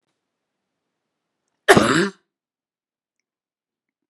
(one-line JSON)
{"cough_length": "4.1 s", "cough_amplitude": 32767, "cough_signal_mean_std_ratio": 0.22, "survey_phase": "beta (2021-08-13 to 2022-03-07)", "age": "45-64", "gender": "Female", "wearing_mask": "No", "symptom_none": true, "smoker_status": "Never smoked", "respiratory_condition_asthma": false, "respiratory_condition_other": false, "recruitment_source": "REACT", "submission_delay": "1 day", "covid_test_result": "Negative", "covid_test_method": "RT-qPCR"}